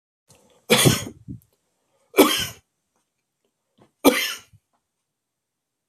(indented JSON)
{
  "three_cough_length": "5.9 s",
  "three_cough_amplitude": 31484,
  "three_cough_signal_mean_std_ratio": 0.28,
  "survey_phase": "beta (2021-08-13 to 2022-03-07)",
  "age": "45-64",
  "gender": "Male",
  "wearing_mask": "No",
  "symptom_none": true,
  "smoker_status": "Never smoked",
  "respiratory_condition_asthma": false,
  "respiratory_condition_other": false,
  "recruitment_source": "REACT",
  "submission_delay": "1 day",
  "covid_test_result": "Negative",
  "covid_test_method": "RT-qPCR"
}